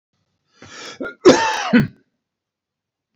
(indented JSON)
{
  "cough_length": "3.2 s",
  "cough_amplitude": 30226,
  "cough_signal_mean_std_ratio": 0.33,
  "survey_phase": "beta (2021-08-13 to 2022-03-07)",
  "age": "65+",
  "gender": "Male",
  "wearing_mask": "No",
  "symptom_none": true,
  "smoker_status": "Never smoked",
  "respiratory_condition_asthma": false,
  "respiratory_condition_other": false,
  "recruitment_source": "REACT",
  "submission_delay": "2 days",
  "covid_test_result": "Negative",
  "covid_test_method": "RT-qPCR",
  "influenza_a_test_result": "Negative",
  "influenza_b_test_result": "Negative"
}